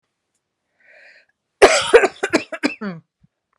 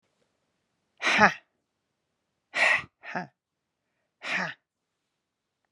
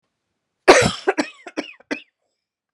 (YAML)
cough_length: 3.6 s
cough_amplitude: 32768
cough_signal_mean_std_ratio: 0.31
exhalation_length: 5.7 s
exhalation_amplitude: 27149
exhalation_signal_mean_std_ratio: 0.28
three_cough_length: 2.7 s
three_cough_amplitude: 32768
three_cough_signal_mean_std_ratio: 0.29
survey_phase: beta (2021-08-13 to 2022-03-07)
age: 45-64
gender: Female
wearing_mask: 'No'
symptom_cough_any: true
symptom_runny_or_blocked_nose: true
symptom_sore_throat: true
symptom_diarrhoea: true
symptom_fatigue: true
symptom_headache: true
symptom_change_to_sense_of_smell_or_taste: true
symptom_loss_of_taste: true
symptom_onset: 3 days
smoker_status: Ex-smoker
respiratory_condition_asthma: true
respiratory_condition_other: false
recruitment_source: Test and Trace
submission_delay: 2 days
covid_test_result: Positive
covid_test_method: RT-qPCR
covid_ct_value: 18.6
covid_ct_gene: N gene